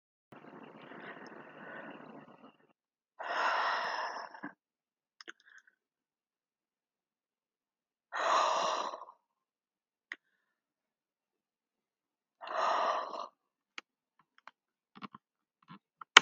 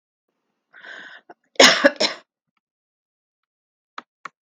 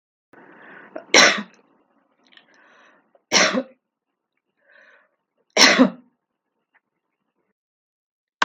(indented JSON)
{
  "exhalation_length": "16.2 s",
  "exhalation_amplitude": 32766,
  "exhalation_signal_mean_std_ratio": 0.27,
  "cough_length": "4.4 s",
  "cough_amplitude": 32768,
  "cough_signal_mean_std_ratio": 0.22,
  "three_cough_length": "8.4 s",
  "three_cough_amplitude": 32768,
  "three_cough_signal_mean_std_ratio": 0.25,
  "survey_phase": "beta (2021-08-13 to 2022-03-07)",
  "age": "65+",
  "gender": "Female",
  "wearing_mask": "No",
  "symptom_none": true,
  "smoker_status": "Never smoked",
  "respiratory_condition_asthma": false,
  "respiratory_condition_other": false,
  "recruitment_source": "REACT",
  "submission_delay": "2 days",
  "covid_test_result": "Negative",
  "covid_test_method": "RT-qPCR",
  "influenza_a_test_result": "Negative",
  "influenza_b_test_result": "Negative"
}